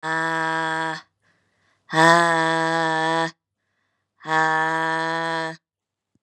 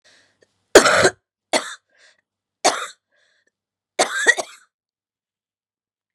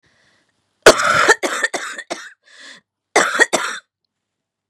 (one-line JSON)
{"exhalation_length": "6.2 s", "exhalation_amplitude": 31546, "exhalation_signal_mean_std_ratio": 0.58, "three_cough_length": "6.1 s", "three_cough_amplitude": 32768, "three_cough_signal_mean_std_ratio": 0.27, "cough_length": "4.7 s", "cough_amplitude": 32768, "cough_signal_mean_std_ratio": 0.37, "survey_phase": "beta (2021-08-13 to 2022-03-07)", "age": "45-64", "gender": "Female", "wearing_mask": "Yes", "symptom_cough_any": true, "symptom_runny_or_blocked_nose": true, "symptom_sore_throat": true, "symptom_fatigue": true, "smoker_status": "Never smoked", "respiratory_condition_asthma": false, "respiratory_condition_other": false, "recruitment_source": "Test and Trace", "submission_delay": "3 days", "covid_test_result": "Negative", "covid_test_method": "RT-qPCR"}